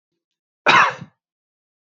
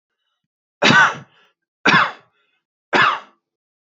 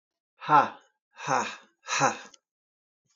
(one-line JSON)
{"cough_length": "1.9 s", "cough_amplitude": 29181, "cough_signal_mean_std_ratio": 0.3, "three_cough_length": "3.8 s", "three_cough_amplitude": 28205, "three_cough_signal_mean_std_ratio": 0.37, "exhalation_length": "3.2 s", "exhalation_amplitude": 14933, "exhalation_signal_mean_std_ratio": 0.35, "survey_phase": "beta (2021-08-13 to 2022-03-07)", "age": "18-44", "gender": "Male", "wearing_mask": "No", "symptom_none": true, "smoker_status": "Never smoked", "respiratory_condition_asthma": false, "respiratory_condition_other": false, "recruitment_source": "REACT", "submission_delay": "2 days", "covid_test_result": "Negative", "covid_test_method": "RT-qPCR"}